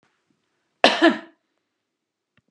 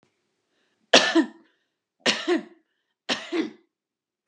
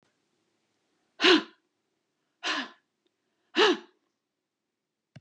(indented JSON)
{
  "cough_length": "2.5 s",
  "cough_amplitude": 32767,
  "cough_signal_mean_std_ratio": 0.25,
  "three_cough_length": "4.3 s",
  "three_cough_amplitude": 29455,
  "three_cough_signal_mean_std_ratio": 0.32,
  "exhalation_length": "5.2 s",
  "exhalation_amplitude": 17123,
  "exhalation_signal_mean_std_ratio": 0.25,
  "survey_phase": "beta (2021-08-13 to 2022-03-07)",
  "age": "65+",
  "gender": "Female",
  "wearing_mask": "No",
  "symptom_none": true,
  "symptom_onset": "9 days",
  "smoker_status": "Ex-smoker",
  "respiratory_condition_asthma": false,
  "respiratory_condition_other": true,
  "recruitment_source": "REACT",
  "submission_delay": "2 days",
  "covid_test_result": "Negative",
  "covid_test_method": "RT-qPCR",
  "influenza_a_test_result": "Unknown/Void",
  "influenza_b_test_result": "Unknown/Void"
}